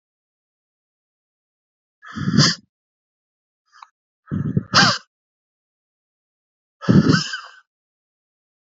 {
  "exhalation_length": "8.6 s",
  "exhalation_amplitude": 30243,
  "exhalation_signal_mean_std_ratio": 0.28,
  "survey_phase": "alpha (2021-03-01 to 2021-08-12)",
  "age": "45-64",
  "gender": "Male",
  "wearing_mask": "No",
  "symptom_none": true,
  "smoker_status": "Ex-smoker",
  "respiratory_condition_asthma": false,
  "respiratory_condition_other": false,
  "recruitment_source": "REACT",
  "submission_delay": "1 day",
  "covid_test_result": "Negative",
  "covid_test_method": "RT-qPCR"
}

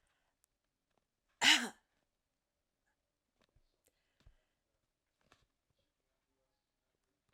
{
  "cough_length": "7.3 s",
  "cough_amplitude": 6324,
  "cough_signal_mean_std_ratio": 0.14,
  "survey_phase": "alpha (2021-03-01 to 2021-08-12)",
  "age": "65+",
  "gender": "Female",
  "wearing_mask": "No",
  "symptom_none": true,
  "smoker_status": "Never smoked",
  "respiratory_condition_asthma": false,
  "respiratory_condition_other": false,
  "recruitment_source": "REACT",
  "submission_delay": "3 days",
  "covid_test_result": "Negative",
  "covid_test_method": "RT-qPCR"
}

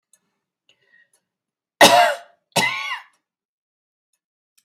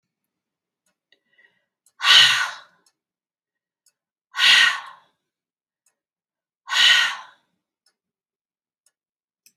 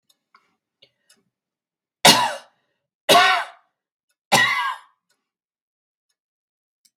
{
  "cough_length": "4.6 s",
  "cough_amplitude": 32768,
  "cough_signal_mean_std_ratio": 0.27,
  "exhalation_length": "9.6 s",
  "exhalation_amplitude": 32536,
  "exhalation_signal_mean_std_ratio": 0.29,
  "three_cough_length": "7.0 s",
  "three_cough_amplitude": 32768,
  "three_cough_signal_mean_std_ratio": 0.29,
  "survey_phase": "beta (2021-08-13 to 2022-03-07)",
  "age": "65+",
  "gender": "Female",
  "wearing_mask": "No",
  "symptom_none": true,
  "smoker_status": "Never smoked",
  "respiratory_condition_asthma": false,
  "respiratory_condition_other": false,
  "recruitment_source": "REACT",
  "submission_delay": "3 days",
  "covid_test_result": "Negative",
  "covid_test_method": "RT-qPCR",
  "influenza_a_test_result": "Negative",
  "influenza_b_test_result": "Negative"
}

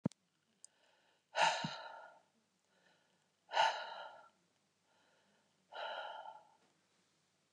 {
  "exhalation_length": "7.5 s",
  "exhalation_amplitude": 4063,
  "exhalation_signal_mean_std_ratio": 0.31,
  "survey_phase": "beta (2021-08-13 to 2022-03-07)",
  "age": "65+",
  "gender": "Female",
  "wearing_mask": "No",
  "symptom_cough_any": true,
  "symptom_runny_or_blocked_nose": true,
  "symptom_diarrhoea": true,
  "symptom_other": true,
  "smoker_status": "Never smoked",
  "respiratory_condition_asthma": false,
  "respiratory_condition_other": false,
  "recruitment_source": "Test and Trace",
  "submission_delay": "1 day",
  "covid_test_result": "Positive",
  "covid_test_method": "LFT"
}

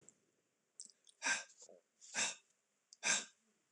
{
  "exhalation_length": "3.7 s",
  "exhalation_amplitude": 2659,
  "exhalation_signal_mean_std_ratio": 0.34,
  "survey_phase": "beta (2021-08-13 to 2022-03-07)",
  "age": "65+",
  "gender": "Male",
  "wearing_mask": "No",
  "symptom_none": true,
  "smoker_status": "Never smoked",
  "respiratory_condition_asthma": false,
  "respiratory_condition_other": false,
  "recruitment_source": "REACT",
  "submission_delay": "2 days",
  "covid_test_result": "Negative",
  "covid_test_method": "RT-qPCR",
  "influenza_a_test_result": "Negative",
  "influenza_b_test_result": "Negative"
}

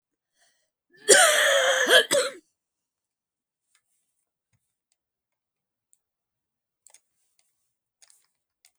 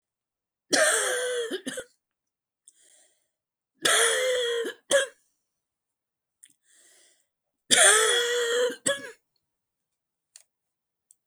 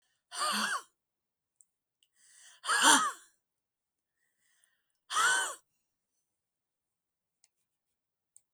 {
  "cough_length": "8.8 s",
  "cough_amplitude": 32767,
  "cough_signal_mean_std_ratio": 0.28,
  "three_cough_length": "11.3 s",
  "three_cough_amplitude": 24258,
  "three_cough_signal_mean_std_ratio": 0.42,
  "exhalation_length": "8.5 s",
  "exhalation_amplitude": 11530,
  "exhalation_signal_mean_std_ratio": 0.3,
  "survey_phase": "beta (2021-08-13 to 2022-03-07)",
  "age": "65+",
  "gender": "Female",
  "wearing_mask": "No",
  "symptom_none": true,
  "smoker_status": "Current smoker (e-cigarettes or vapes only)",
  "respiratory_condition_asthma": false,
  "respiratory_condition_other": true,
  "recruitment_source": "REACT",
  "submission_delay": "1 day",
  "covid_test_result": "Negative",
  "covid_test_method": "RT-qPCR"
}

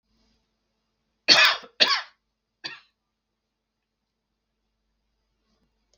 {
  "cough_length": "6.0 s",
  "cough_amplitude": 32421,
  "cough_signal_mean_std_ratio": 0.22,
  "survey_phase": "beta (2021-08-13 to 2022-03-07)",
  "age": "65+",
  "gender": "Male",
  "wearing_mask": "No",
  "symptom_none": true,
  "symptom_onset": "12 days",
  "smoker_status": "Ex-smoker",
  "respiratory_condition_asthma": false,
  "respiratory_condition_other": false,
  "recruitment_source": "REACT",
  "submission_delay": "2 days",
  "covid_test_result": "Negative",
  "covid_test_method": "RT-qPCR",
  "influenza_a_test_result": "Negative",
  "influenza_b_test_result": "Negative"
}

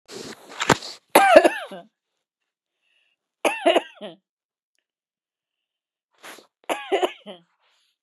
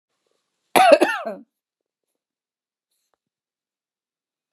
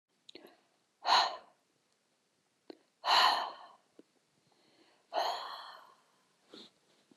{
  "three_cough_length": "8.0 s",
  "three_cough_amplitude": 32768,
  "three_cough_signal_mean_std_ratio": 0.27,
  "cough_length": "4.5 s",
  "cough_amplitude": 32766,
  "cough_signal_mean_std_ratio": 0.23,
  "exhalation_length": "7.2 s",
  "exhalation_amplitude": 6604,
  "exhalation_signal_mean_std_ratio": 0.31,
  "survey_phase": "beta (2021-08-13 to 2022-03-07)",
  "age": "45-64",
  "gender": "Female",
  "wearing_mask": "No",
  "symptom_none": true,
  "smoker_status": "Never smoked",
  "respiratory_condition_asthma": false,
  "respiratory_condition_other": false,
  "recruitment_source": "REACT",
  "submission_delay": "1 day",
  "covid_test_result": "Negative",
  "covid_test_method": "RT-qPCR",
  "influenza_a_test_result": "Negative",
  "influenza_b_test_result": "Negative"
}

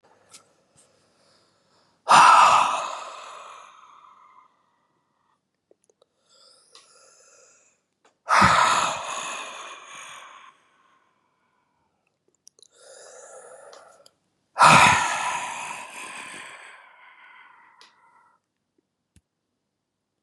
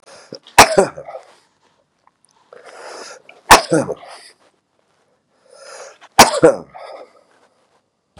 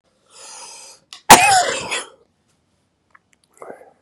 {
  "exhalation_length": "20.2 s",
  "exhalation_amplitude": 28583,
  "exhalation_signal_mean_std_ratio": 0.29,
  "three_cough_length": "8.2 s",
  "three_cough_amplitude": 32768,
  "three_cough_signal_mean_std_ratio": 0.26,
  "cough_length": "4.0 s",
  "cough_amplitude": 32768,
  "cough_signal_mean_std_ratio": 0.28,
  "survey_phase": "beta (2021-08-13 to 2022-03-07)",
  "age": "65+",
  "gender": "Male",
  "wearing_mask": "No",
  "symptom_runny_or_blocked_nose": true,
  "smoker_status": "Ex-smoker",
  "respiratory_condition_asthma": true,
  "respiratory_condition_other": false,
  "recruitment_source": "REACT",
  "submission_delay": "2 days",
  "covid_test_result": "Negative",
  "covid_test_method": "RT-qPCR",
  "influenza_a_test_result": "Negative",
  "influenza_b_test_result": "Negative"
}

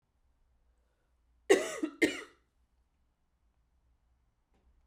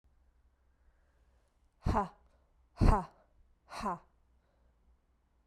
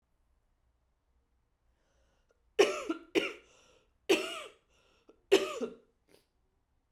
{
  "cough_length": "4.9 s",
  "cough_amplitude": 10013,
  "cough_signal_mean_std_ratio": 0.21,
  "exhalation_length": "5.5 s",
  "exhalation_amplitude": 7783,
  "exhalation_signal_mean_std_ratio": 0.26,
  "three_cough_length": "6.9 s",
  "three_cough_amplitude": 8338,
  "three_cough_signal_mean_std_ratio": 0.26,
  "survey_phase": "beta (2021-08-13 to 2022-03-07)",
  "age": "18-44",
  "gender": "Female",
  "wearing_mask": "No",
  "symptom_cough_any": true,
  "symptom_runny_or_blocked_nose": true,
  "symptom_sore_throat": true,
  "symptom_fatigue": true,
  "symptom_change_to_sense_of_smell_or_taste": true,
  "symptom_onset": "3 days",
  "smoker_status": "Ex-smoker",
  "respiratory_condition_asthma": false,
  "respiratory_condition_other": false,
  "recruitment_source": "Test and Trace",
  "submission_delay": "2 days",
  "covid_test_result": "Positive",
  "covid_test_method": "RT-qPCR",
  "covid_ct_value": 30.6,
  "covid_ct_gene": "N gene"
}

